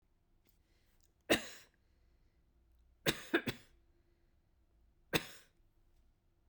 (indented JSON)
{
  "three_cough_length": "6.5 s",
  "three_cough_amplitude": 5272,
  "three_cough_signal_mean_std_ratio": 0.22,
  "survey_phase": "beta (2021-08-13 to 2022-03-07)",
  "age": "45-64",
  "gender": "Female",
  "wearing_mask": "No",
  "symptom_sore_throat": true,
  "symptom_fatigue": true,
  "symptom_headache": true,
  "symptom_other": true,
  "smoker_status": "Never smoked",
  "respiratory_condition_asthma": false,
  "respiratory_condition_other": false,
  "recruitment_source": "Test and Trace",
  "submission_delay": "2 days",
  "covid_test_result": "Positive",
  "covid_test_method": "LFT"
}